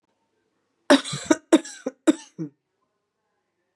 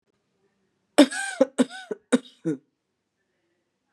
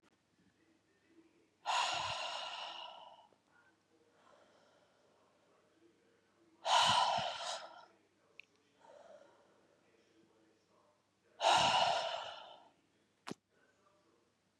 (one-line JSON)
{"cough_length": "3.8 s", "cough_amplitude": 23791, "cough_signal_mean_std_ratio": 0.25, "three_cough_length": "3.9 s", "three_cough_amplitude": 30223, "three_cough_signal_mean_std_ratio": 0.25, "exhalation_length": "14.6 s", "exhalation_amplitude": 4940, "exhalation_signal_mean_std_ratio": 0.35, "survey_phase": "beta (2021-08-13 to 2022-03-07)", "age": "45-64", "gender": "Female", "wearing_mask": "No", "symptom_runny_or_blocked_nose": true, "symptom_fatigue": true, "symptom_fever_high_temperature": true, "symptom_onset": "2 days", "smoker_status": "Ex-smoker", "respiratory_condition_asthma": false, "respiratory_condition_other": false, "recruitment_source": "Test and Trace", "submission_delay": "1 day", "covid_test_result": "Positive", "covid_test_method": "RT-qPCR", "covid_ct_value": 22.5, "covid_ct_gene": "S gene", "covid_ct_mean": 22.8, "covid_viral_load": "33000 copies/ml", "covid_viral_load_category": "Low viral load (10K-1M copies/ml)"}